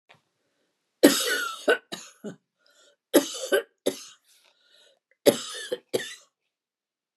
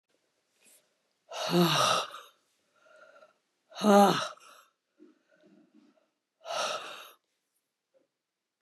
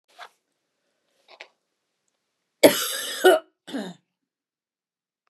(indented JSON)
{
  "three_cough_length": "7.2 s",
  "three_cough_amplitude": 29496,
  "three_cough_signal_mean_std_ratio": 0.3,
  "exhalation_length": "8.6 s",
  "exhalation_amplitude": 11011,
  "exhalation_signal_mean_std_ratio": 0.31,
  "cough_length": "5.3 s",
  "cough_amplitude": 32481,
  "cough_signal_mean_std_ratio": 0.23,
  "survey_phase": "beta (2021-08-13 to 2022-03-07)",
  "age": "65+",
  "gender": "Female",
  "wearing_mask": "No",
  "symptom_none": true,
  "smoker_status": "Ex-smoker",
  "respiratory_condition_asthma": false,
  "respiratory_condition_other": false,
  "recruitment_source": "REACT",
  "submission_delay": "3 days",
  "covid_test_result": "Negative",
  "covid_test_method": "RT-qPCR",
  "influenza_a_test_result": "Negative",
  "influenza_b_test_result": "Negative"
}